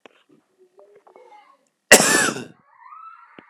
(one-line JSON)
{"cough_length": "3.5 s", "cough_amplitude": 32768, "cough_signal_mean_std_ratio": 0.27, "survey_phase": "alpha (2021-03-01 to 2021-08-12)", "age": "45-64", "gender": "Male", "wearing_mask": "No", "symptom_fatigue": true, "symptom_headache": true, "symptom_onset": "4 days", "smoker_status": "Never smoked", "respiratory_condition_asthma": true, "respiratory_condition_other": false, "recruitment_source": "Test and Trace", "submission_delay": "1 day", "covid_test_result": "Positive", "covid_test_method": "RT-qPCR"}